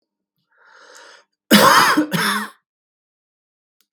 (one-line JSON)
{"cough_length": "3.9 s", "cough_amplitude": 32768, "cough_signal_mean_std_ratio": 0.37, "survey_phase": "beta (2021-08-13 to 2022-03-07)", "age": "45-64", "gender": "Male", "wearing_mask": "No", "symptom_cough_any": true, "symptom_sore_throat": true, "symptom_fatigue": true, "symptom_headache": true, "symptom_change_to_sense_of_smell_or_taste": true, "symptom_loss_of_taste": true, "symptom_onset": "12 days", "smoker_status": "Never smoked", "respiratory_condition_asthma": false, "respiratory_condition_other": false, "recruitment_source": "REACT", "submission_delay": "1 day", "covid_test_result": "Negative", "covid_test_method": "RT-qPCR", "influenza_a_test_result": "Unknown/Void", "influenza_b_test_result": "Unknown/Void"}